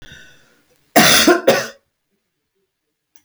{"cough_length": "3.2 s", "cough_amplitude": 32768, "cough_signal_mean_std_ratio": 0.36, "survey_phase": "alpha (2021-03-01 to 2021-08-12)", "age": "65+", "gender": "Female", "wearing_mask": "No", "symptom_none": true, "smoker_status": "Never smoked", "respiratory_condition_asthma": false, "respiratory_condition_other": false, "recruitment_source": "REACT", "submission_delay": "1 day", "covid_test_result": "Negative", "covid_test_method": "RT-qPCR"}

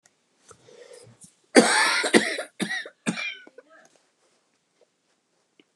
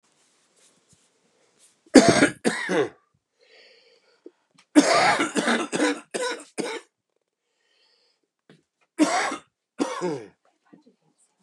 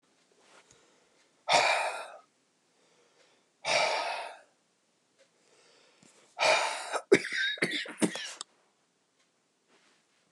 {"cough_length": "5.8 s", "cough_amplitude": 31845, "cough_signal_mean_std_ratio": 0.32, "three_cough_length": "11.4 s", "three_cough_amplitude": 32768, "three_cough_signal_mean_std_ratio": 0.35, "exhalation_length": "10.3 s", "exhalation_amplitude": 12026, "exhalation_signal_mean_std_ratio": 0.37, "survey_phase": "beta (2021-08-13 to 2022-03-07)", "age": "45-64", "gender": "Male", "wearing_mask": "No", "symptom_cough_any": true, "symptom_new_continuous_cough": true, "symptom_runny_or_blocked_nose": true, "symptom_shortness_of_breath": true, "symptom_sore_throat": true, "symptom_diarrhoea": true, "symptom_fatigue": true, "symptom_fever_high_temperature": true, "symptom_headache": true, "smoker_status": "Never smoked", "respiratory_condition_asthma": false, "respiratory_condition_other": false, "recruitment_source": "Test and Trace", "submission_delay": "1 day", "covid_test_result": "Positive", "covid_test_method": "RT-qPCR", "covid_ct_value": 20.9, "covid_ct_gene": "ORF1ab gene", "covid_ct_mean": 21.6, "covid_viral_load": "85000 copies/ml", "covid_viral_load_category": "Low viral load (10K-1M copies/ml)"}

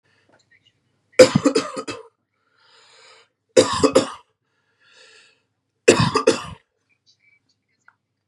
{"three_cough_length": "8.3 s", "three_cough_amplitude": 32768, "three_cough_signal_mean_std_ratio": 0.27, "survey_phase": "beta (2021-08-13 to 2022-03-07)", "age": "18-44", "gender": "Male", "wearing_mask": "No", "symptom_none": true, "symptom_onset": "8 days", "smoker_status": "Ex-smoker", "respiratory_condition_asthma": false, "respiratory_condition_other": false, "recruitment_source": "Test and Trace", "submission_delay": "1 day", "covid_test_result": "Positive", "covid_test_method": "ePCR"}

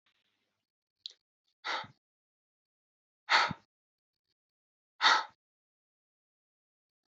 {"exhalation_length": "7.1 s", "exhalation_amplitude": 8983, "exhalation_signal_mean_std_ratio": 0.21, "survey_phase": "alpha (2021-03-01 to 2021-08-12)", "age": "45-64", "gender": "Male", "wearing_mask": "No", "symptom_cough_any": true, "symptom_fatigue": true, "symptom_change_to_sense_of_smell_or_taste": true, "symptom_onset": "7 days", "smoker_status": "Ex-smoker", "respiratory_condition_asthma": false, "respiratory_condition_other": false, "recruitment_source": "Test and Trace", "submission_delay": "1 day", "covid_test_result": "Positive", "covid_test_method": "RT-qPCR", "covid_ct_value": 24.4, "covid_ct_gene": "ORF1ab gene", "covid_ct_mean": 24.7, "covid_viral_load": "8100 copies/ml", "covid_viral_load_category": "Minimal viral load (< 10K copies/ml)"}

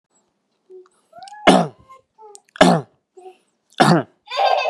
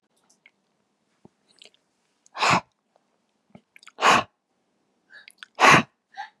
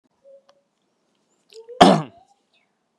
{"three_cough_length": "4.7 s", "three_cough_amplitude": 32768, "three_cough_signal_mean_std_ratio": 0.36, "exhalation_length": "6.4 s", "exhalation_amplitude": 28547, "exhalation_signal_mean_std_ratio": 0.25, "cough_length": "3.0 s", "cough_amplitude": 32768, "cough_signal_mean_std_ratio": 0.2, "survey_phase": "beta (2021-08-13 to 2022-03-07)", "age": "18-44", "gender": "Male", "wearing_mask": "No", "symptom_none": true, "smoker_status": "Ex-smoker", "respiratory_condition_asthma": false, "respiratory_condition_other": false, "recruitment_source": "REACT", "submission_delay": "1 day", "covid_test_result": "Negative", "covid_test_method": "RT-qPCR", "influenza_a_test_result": "Negative", "influenza_b_test_result": "Negative"}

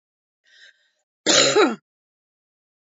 {"cough_length": "3.0 s", "cough_amplitude": 26293, "cough_signal_mean_std_ratio": 0.32, "survey_phase": "beta (2021-08-13 to 2022-03-07)", "age": "45-64", "gender": "Female", "wearing_mask": "No", "symptom_cough_any": true, "symptom_runny_or_blocked_nose": true, "symptom_shortness_of_breath": true, "symptom_fatigue": true, "symptom_other": true, "symptom_onset": "6 days", "smoker_status": "Ex-smoker", "respiratory_condition_asthma": false, "respiratory_condition_other": false, "recruitment_source": "Test and Trace", "submission_delay": "2 days", "covid_test_result": "Positive", "covid_test_method": "RT-qPCR", "covid_ct_value": 16.4, "covid_ct_gene": "ORF1ab gene", "covid_ct_mean": 16.6, "covid_viral_load": "3700000 copies/ml", "covid_viral_load_category": "High viral load (>1M copies/ml)"}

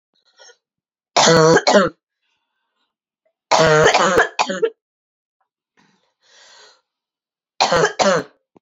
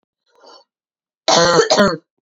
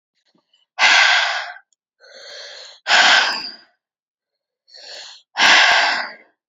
{"three_cough_length": "8.6 s", "three_cough_amplitude": 31201, "three_cough_signal_mean_std_ratio": 0.41, "cough_length": "2.2 s", "cough_amplitude": 32767, "cough_signal_mean_std_ratio": 0.45, "exhalation_length": "6.5 s", "exhalation_amplitude": 32608, "exhalation_signal_mean_std_ratio": 0.46, "survey_phase": "beta (2021-08-13 to 2022-03-07)", "age": "18-44", "gender": "Female", "wearing_mask": "No", "symptom_cough_any": true, "symptom_runny_or_blocked_nose": true, "symptom_shortness_of_breath": true, "symptom_sore_throat": true, "symptom_abdominal_pain": true, "symptom_fatigue": true, "symptom_headache": true, "symptom_change_to_sense_of_smell_or_taste": true, "symptom_loss_of_taste": true, "symptom_onset": "3 days", "smoker_status": "Ex-smoker", "respiratory_condition_asthma": false, "respiratory_condition_other": false, "recruitment_source": "Test and Trace", "submission_delay": "1 day", "covid_test_result": "Positive", "covid_test_method": "RT-qPCR", "covid_ct_value": 19.9, "covid_ct_gene": "ORF1ab gene", "covid_ct_mean": 20.5, "covid_viral_load": "190000 copies/ml", "covid_viral_load_category": "Low viral load (10K-1M copies/ml)"}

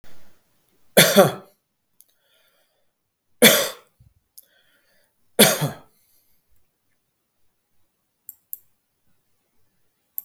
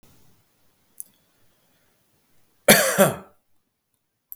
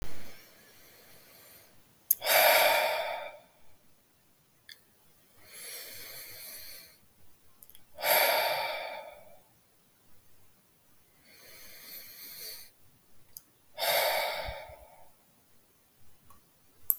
{"three_cough_length": "10.2 s", "three_cough_amplitude": 32766, "three_cough_signal_mean_std_ratio": 0.23, "cough_length": "4.4 s", "cough_amplitude": 32766, "cough_signal_mean_std_ratio": 0.24, "exhalation_length": "17.0 s", "exhalation_amplitude": 32766, "exhalation_signal_mean_std_ratio": 0.4, "survey_phase": "beta (2021-08-13 to 2022-03-07)", "age": "45-64", "gender": "Male", "wearing_mask": "No", "symptom_none": true, "smoker_status": "Ex-smoker", "respiratory_condition_asthma": false, "respiratory_condition_other": false, "recruitment_source": "REACT", "submission_delay": "2 days", "covid_test_result": "Negative", "covid_test_method": "RT-qPCR", "influenza_a_test_result": "Negative", "influenza_b_test_result": "Negative"}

